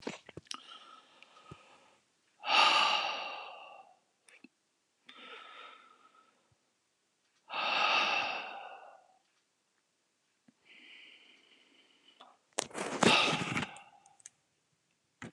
{"exhalation_length": "15.3 s", "exhalation_amplitude": 12432, "exhalation_signal_mean_std_ratio": 0.36, "survey_phase": "alpha (2021-03-01 to 2021-08-12)", "age": "65+", "gender": "Male", "wearing_mask": "No", "symptom_none": true, "smoker_status": "Ex-smoker", "respiratory_condition_asthma": false, "respiratory_condition_other": false, "recruitment_source": "REACT", "submission_delay": "8 days", "covid_test_result": "Negative", "covid_test_method": "RT-qPCR"}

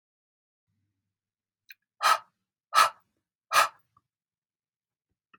{"exhalation_length": "5.4 s", "exhalation_amplitude": 16615, "exhalation_signal_mean_std_ratio": 0.22, "survey_phase": "beta (2021-08-13 to 2022-03-07)", "age": "45-64", "gender": "Female", "wearing_mask": "No", "symptom_fatigue": true, "symptom_onset": "5 days", "smoker_status": "Ex-smoker", "respiratory_condition_asthma": false, "respiratory_condition_other": false, "recruitment_source": "REACT", "submission_delay": "1 day", "covid_test_result": "Negative", "covid_test_method": "RT-qPCR", "influenza_a_test_result": "Negative", "influenza_b_test_result": "Negative"}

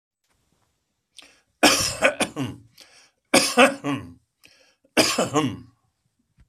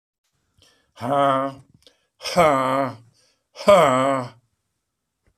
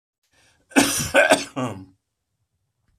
{"three_cough_length": "6.5 s", "three_cough_amplitude": 29174, "three_cough_signal_mean_std_ratio": 0.38, "exhalation_length": "5.4 s", "exhalation_amplitude": 24920, "exhalation_signal_mean_std_ratio": 0.43, "cough_length": "3.0 s", "cough_amplitude": 25738, "cough_signal_mean_std_ratio": 0.36, "survey_phase": "beta (2021-08-13 to 2022-03-07)", "age": "65+", "gender": "Male", "wearing_mask": "No", "symptom_runny_or_blocked_nose": true, "smoker_status": "Never smoked", "respiratory_condition_asthma": false, "respiratory_condition_other": false, "recruitment_source": "Test and Trace", "submission_delay": "1 day", "covid_test_result": "Positive", "covid_test_method": "RT-qPCR", "covid_ct_value": 31.6, "covid_ct_gene": "ORF1ab gene"}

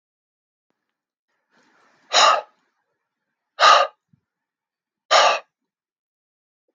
{"exhalation_length": "6.7 s", "exhalation_amplitude": 27614, "exhalation_signal_mean_std_ratio": 0.27, "survey_phase": "beta (2021-08-13 to 2022-03-07)", "age": "45-64", "gender": "Male", "wearing_mask": "No", "symptom_none": true, "smoker_status": "Ex-smoker", "respiratory_condition_asthma": false, "respiratory_condition_other": false, "recruitment_source": "REACT", "submission_delay": "1 day", "covid_test_result": "Negative", "covid_test_method": "RT-qPCR"}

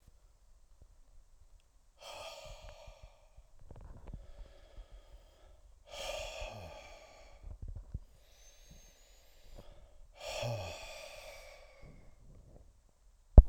{"exhalation_length": "13.5 s", "exhalation_amplitude": 22573, "exhalation_signal_mean_std_ratio": 0.17, "survey_phase": "alpha (2021-03-01 to 2021-08-12)", "age": "45-64", "gender": "Male", "wearing_mask": "No", "symptom_cough_any": true, "symptom_abdominal_pain": true, "symptom_fatigue": true, "symptom_headache": true, "symptom_change_to_sense_of_smell_or_taste": true, "symptom_onset": "8 days", "smoker_status": "Never smoked", "respiratory_condition_asthma": false, "respiratory_condition_other": false, "recruitment_source": "Test and Trace", "submission_delay": "2 days", "covid_test_result": "Positive", "covid_test_method": "RT-qPCR", "covid_ct_value": 13.6, "covid_ct_gene": "ORF1ab gene", "covid_ct_mean": 14.1, "covid_viral_load": "24000000 copies/ml", "covid_viral_load_category": "High viral load (>1M copies/ml)"}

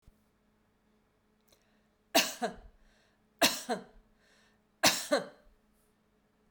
{"three_cough_length": "6.5 s", "three_cough_amplitude": 11278, "three_cough_signal_mean_std_ratio": 0.27, "survey_phase": "beta (2021-08-13 to 2022-03-07)", "age": "45-64", "gender": "Female", "wearing_mask": "No", "symptom_headache": true, "smoker_status": "Never smoked", "respiratory_condition_asthma": false, "respiratory_condition_other": false, "recruitment_source": "REACT", "submission_delay": "2 days", "covid_test_result": "Negative", "covid_test_method": "RT-qPCR"}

